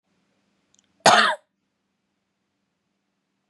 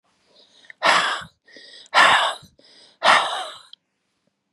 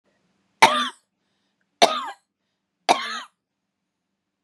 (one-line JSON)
{"cough_length": "3.5 s", "cough_amplitude": 31799, "cough_signal_mean_std_ratio": 0.22, "exhalation_length": "4.5 s", "exhalation_amplitude": 29655, "exhalation_signal_mean_std_ratio": 0.4, "three_cough_length": "4.4 s", "three_cough_amplitude": 32767, "three_cough_signal_mean_std_ratio": 0.26, "survey_phase": "beta (2021-08-13 to 2022-03-07)", "age": "18-44", "gender": "Female", "wearing_mask": "No", "symptom_runny_or_blocked_nose": true, "symptom_other": true, "symptom_onset": "13 days", "smoker_status": "Ex-smoker", "respiratory_condition_asthma": false, "respiratory_condition_other": false, "recruitment_source": "REACT", "submission_delay": "1 day", "covid_test_result": "Negative", "covid_test_method": "RT-qPCR", "influenza_a_test_result": "Negative", "influenza_b_test_result": "Negative"}